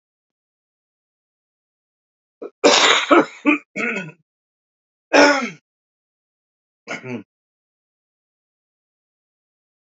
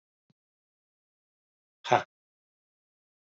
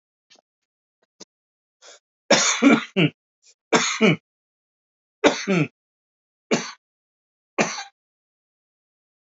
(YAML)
cough_length: 10.0 s
cough_amplitude: 29896
cough_signal_mean_std_ratio: 0.28
exhalation_length: 3.2 s
exhalation_amplitude: 14841
exhalation_signal_mean_std_ratio: 0.13
three_cough_length: 9.4 s
three_cough_amplitude: 28418
three_cough_signal_mean_std_ratio: 0.31
survey_phase: beta (2021-08-13 to 2022-03-07)
age: 45-64
gender: Male
wearing_mask: 'No'
symptom_cough_any: true
symptom_fatigue: true
symptom_fever_high_temperature: true
symptom_headache: true
smoker_status: Never smoked
respiratory_condition_asthma: true
respiratory_condition_other: false
recruitment_source: Test and Trace
submission_delay: 1 day
covid_test_result: Positive
covid_test_method: RT-qPCR
covid_ct_value: 23.7
covid_ct_gene: ORF1ab gene
covid_ct_mean: 24.5
covid_viral_load: 9100 copies/ml
covid_viral_load_category: Minimal viral load (< 10K copies/ml)